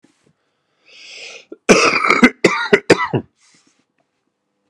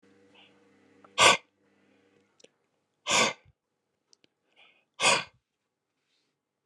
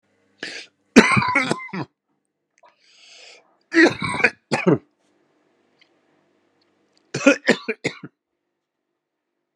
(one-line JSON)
{"cough_length": "4.7 s", "cough_amplitude": 32768, "cough_signal_mean_std_ratio": 0.36, "exhalation_length": "6.7 s", "exhalation_amplitude": 20999, "exhalation_signal_mean_std_ratio": 0.24, "three_cough_length": "9.6 s", "three_cough_amplitude": 32768, "three_cough_signal_mean_std_ratio": 0.3, "survey_phase": "beta (2021-08-13 to 2022-03-07)", "age": "45-64", "gender": "Male", "wearing_mask": "No", "symptom_cough_any": true, "symptom_runny_or_blocked_nose": true, "symptom_shortness_of_breath": true, "symptom_fatigue": true, "symptom_onset": "3 days", "smoker_status": "Ex-smoker", "respiratory_condition_asthma": false, "respiratory_condition_other": false, "recruitment_source": "Test and Trace", "submission_delay": "2 days", "covid_test_result": "Positive", "covid_test_method": "RT-qPCR", "covid_ct_value": 12.0, "covid_ct_gene": "ORF1ab gene", "covid_ct_mean": 12.2, "covid_viral_load": "97000000 copies/ml", "covid_viral_load_category": "High viral load (>1M copies/ml)"}